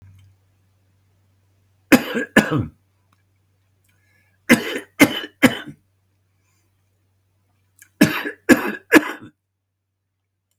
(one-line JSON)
{"three_cough_length": "10.6 s", "three_cough_amplitude": 32768, "three_cough_signal_mean_std_ratio": 0.26, "survey_phase": "beta (2021-08-13 to 2022-03-07)", "age": "65+", "gender": "Male", "wearing_mask": "No", "symptom_cough_any": true, "smoker_status": "Ex-smoker", "respiratory_condition_asthma": false, "respiratory_condition_other": true, "recruitment_source": "REACT", "submission_delay": "1 day", "covid_test_result": "Negative", "covid_test_method": "RT-qPCR", "influenza_a_test_result": "Negative", "influenza_b_test_result": "Negative"}